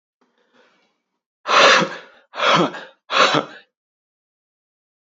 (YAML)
exhalation_length: 5.1 s
exhalation_amplitude: 29191
exhalation_signal_mean_std_ratio: 0.37
survey_phase: beta (2021-08-13 to 2022-03-07)
age: 18-44
gender: Male
wearing_mask: 'No'
symptom_none: true
smoker_status: Never smoked
respiratory_condition_asthma: false
respiratory_condition_other: false
recruitment_source: REACT
submission_delay: 3 days
covid_test_result: Negative
covid_test_method: RT-qPCR
influenza_a_test_result: Negative
influenza_b_test_result: Negative